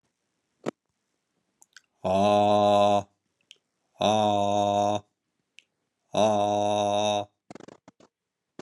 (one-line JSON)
{"exhalation_length": "8.6 s", "exhalation_amplitude": 10604, "exhalation_signal_mean_std_ratio": 0.52, "survey_phase": "beta (2021-08-13 to 2022-03-07)", "age": "45-64", "gender": "Male", "wearing_mask": "No", "symptom_cough_any": true, "symptom_abdominal_pain": true, "symptom_fatigue": true, "symptom_fever_high_temperature": true, "symptom_headache": true, "symptom_onset": "3 days", "smoker_status": "Never smoked", "respiratory_condition_asthma": true, "respiratory_condition_other": false, "recruitment_source": "Test and Trace", "submission_delay": "2 days", "covid_test_result": "Positive", "covid_test_method": "RT-qPCR", "covid_ct_value": 16.3, "covid_ct_gene": "ORF1ab gene", "covid_ct_mean": 17.8, "covid_viral_load": "1400000 copies/ml", "covid_viral_load_category": "High viral load (>1M copies/ml)"}